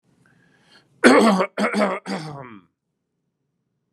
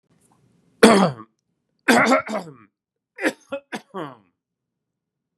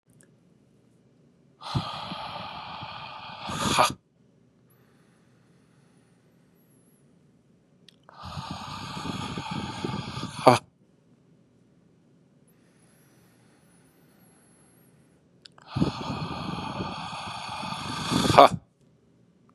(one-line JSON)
{"cough_length": "3.9 s", "cough_amplitude": 32767, "cough_signal_mean_std_ratio": 0.37, "three_cough_length": "5.4 s", "three_cough_amplitude": 32767, "three_cough_signal_mean_std_ratio": 0.31, "exhalation_length": "19.5 s", "exhalation_amplitude": 32768, "exhalation_signal_mean_std_ratio": 0.31, "survey_phase": "beta (2021-08-13 to 2022-03-07)", "age": "45-64", "gender": "Male", "wearing_mask": "No", "symptom_cough_any": true, "symptom_sore_throat": true, "smoker_status": "Ex-smoker", "respiratory_condition_asthma": false, "respiratory_condition_other": false, "recruitment_source": "Test and Trace", "submission_delay": "0 days", "covid_test_result": "Negative", "covid_test_method": "LFT"}